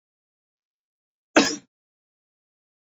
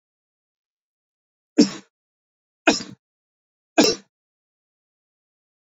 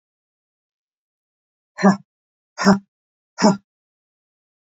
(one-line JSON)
{"cough_length": "3.0 s", "cough_amplitude": 26640, "cough_signal_mean_std_ratio": 0.16, "three_cough_length": "5.7 s", "three_cough_amplitude": 28616, "three_cough_signal_mean_std_ratio": 0.19, "exhalation_length": "4.7 s", "exhalation_amplitude": 28568, "exhalation_signal_mean_std_ratio": 0.24, "survey_phase": "beta (2021-08-13 to 2022-03-07)", "age": "45-64", "gender": "Male", "wearing_mask": "No", "symptom_cough_any": true, "symptom_runny_or_blocked_nose": true, "symptom_headache": true, "symptom_onset": "4 days", "smoker_status": "Ex-smoker", "respiratory_condition_asthma": false, "respiratory_condition_other": false, "recruitment_source": "Test and Trace", "submission_delay": "2 days", "covid_test_result": "Positive", "covid_test_method": "RT-qPCR", "covid_ct_value": 11.7, "covid_ct_gene": "ORF1ab gene", "covid_ct_mean": 12.2, "covid_viral_load": "99000000 copies/ml", "covid_viral_load_category": "High viral load (>1M copies/ml)"}